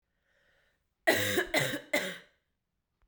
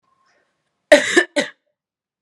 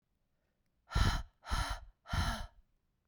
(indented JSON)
{
  "three_cough_length": "3.1 s",
  "three_cough_amplitude": 11381,
  "three_cough_signal_mean_std_ratio": 0.41,
  "cough_length": "2.2 s",
  "cough_amplitude": 32768,
  "cough_signal_mean_std_ratio": 0.28,
  "exhalation_length": "3.1 s",
  "exhalation_amplitude": 4989,
  "exhalation_signal_mean_std_ratio": 0.45,
  "survey_phase": "beta (2021-08-13 to 2022-03-07)",
  "age": "18-44",
  "gender": "Female",
  "wearing_mask": "No",
  "symptom_cough_any": true,
  "symptom_sore_throat": true,
  "symptom_fatigue": true,
  "smoker_status": "Never smoked",
  "respiratory_condition_asthma": false,
  "respiratory_condition_other": false,
  "recruitment_source": "Test and Trace",
  "submission_delay": "2 days",
  "covid_test_result": "Positive",
  "covid_test_method": "RT-qPCR",
  "covid_ct_value": 16.4,
  "covid_ct_gene": "ORF1ab gene",
  "covid_ct_mean": 16.6,
  "covid_viral_load": "3600000 copies/ml",
  "covid_viral_load_category": "High viral load (>1M copies/ml)"
}